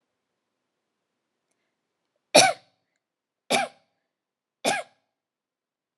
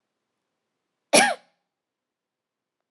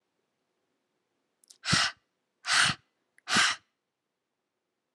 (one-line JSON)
{"three_cough_length": "6.0 s", "three_cough_amplitude": 27071, "three_cough_signal_mean_std_ratio": 0.2, "cough_length": "2.9 s", "cough_amplitude": 25035, "cough_signal_mean_std_ratio": 0.2, "exhalation_length": "4.9 s", "exhalation_amplitude": 9667, "exhalation_signal_mean_std_ratio": 0.31, "survey_phase": "alpha (2021-03-01 to 2021-08-12)", "age": "18-44", "gender": "Female", "wearing_mask": "No", "symptom_none": true, "smoker_status": "Never smoked", "respiratory_condition_asthma": false, "respiratory_condition_other": false, "recruitment_source": "REACT", "submission_delay": "5 days", "covid_test_result": "Negative", "covid_test_method": "RT-qPCR"}